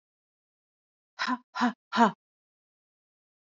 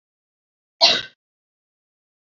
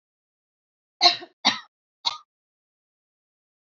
{"exhalation_length": "3.5 s", "exhalation_amplitude": 13051, "exhalation_signal_mean_std_ratio": 0.26, "cough_length": "2.2 s", "cough_amplitude": 27996, "cough_signal_mean_std_ratio": 0.22, "three_cough_length": "3.7 s", "three_cough_amplitude": 24629, "three_cough_signal_mean_std_ratio": 0.21, "survey_phase": "beta (2021-08-13 to 2022-03-07)", "age": "18-44", "gender": "Female", "wearing_mask": "No", "symptom_cough_any": true, "symptom_new_continuous_cough": true, "symptom_runny_or_blocked_nose": true, "symptom_sore_throat": true, "symptom_onset": "4 days", "smoker_status": "Never smoked", "respiratory_condition_asthma": false, "respiratory_condition_other": false, "recruitment_source": "Test and Trace", "submission_delay": "2 days", "covid_test_method": "RT-qPCR", "covid_ct_value": 30.9, "covid_ct_gene": "N gene", "covid_ct_mean": 31.1, "covid_viral_load": "65 copies/ml", "covid_viral_load_category": "Minimal viral load (< 10K copies/ml)"}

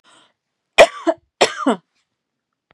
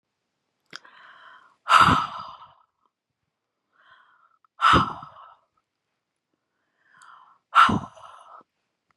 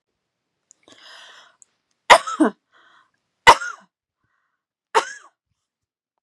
{"cough_length": "2.7 s", "cough_amplitude": 32768, "cough_signal_mean_std_ratio": 0.26, "exhalation_length": "9.0 s", "exhalation_amplitude": 23161, "exhalation_signal_mean_std_ratio": 0.27, "three_cough_length": "6.2 s", "three_cough_amplitude": 32768, "three_cough_signal_mean_std_ratio": 0.19, "survey_phase": "beta (2021-08-13 to 2022-03-07)", "age": "45-64", "gender": "Female", "wearing_mask": "No", "symptom_none": true, "smoker_status": "Never smoked", "respiratory_condition_asthma": false, "respiratory_condition_other": false, "recruitment_source": "REACT", "submission_delay": "3 days", "covid_test_result": "Negative", "covid_test_method": "RT-qPCR", "influenza_a_test_result": "Negative", "influenza_b_test_result": "Negative"}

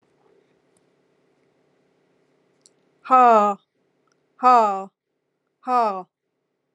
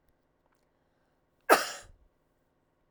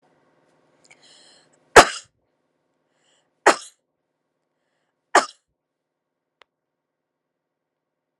{"exhalation_length": "6.7 s", "exhalation_amplitude": 25732, "exhalation_signal_mean_std_ratio": 0.31, "cough_length": "2.9 s", "cough_amplitude": 19440, "cough_signal_mean_std_ratio": 0.18, "three_cough_length": "8.2 s", "three_cough_amplitude": 32768, "three_cough_signal_mean_std_ratio": 0.13, "survey_phase": "alpha (2021-03-01 to 2021-08-12)", "age": "45-64", "gender": "Female", "wearing_mask": "No", "symptom_cough_any": true, "symptom_fatigue": true, "symptom_headache": true, "smoker_status": "Never smoked", "respiratory_condition_asthma": false, "respiratory_condition_other": false, "recruitment_source": "REACT", "submission_delay": "1 day", "covid_test_result": "Negative", "covid_test_method": "RT-qPCR"}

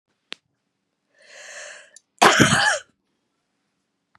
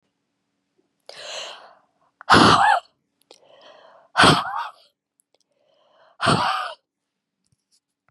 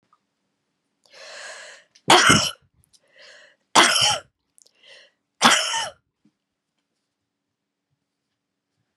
{"cough_length": "4.2 s", "cough_amplitude": 32768, "cough_signal_mean_std_ratio": 0.3, "exhalation_length": "8.1 s", "exhalation_amplitude": 31646, "exhalation_signal_mean_std_ratio": 0.32, "three_cough_length": "9.0 s", "three_cough_amplitude": 32072, "three_cough_signal_mean_std_ratio": 0.29, "survey_phase": "beta (2021-08-13 to 2022-03-07)", "age": "45-64", "gender": "Female", "wearing_mask": "No", "symptom_runny_or_blocked_nose": true, "symptom_sore_throat": true, "smoker_status": "Never smoked", "respiratory_condition_asthma": true, "respiratory_condition_other": true, "recruitment_source": "Test and Trace", "submission_delay": "2 days", "covid_test_result": "Negative", "covid_test_method": "RT-qPCR"}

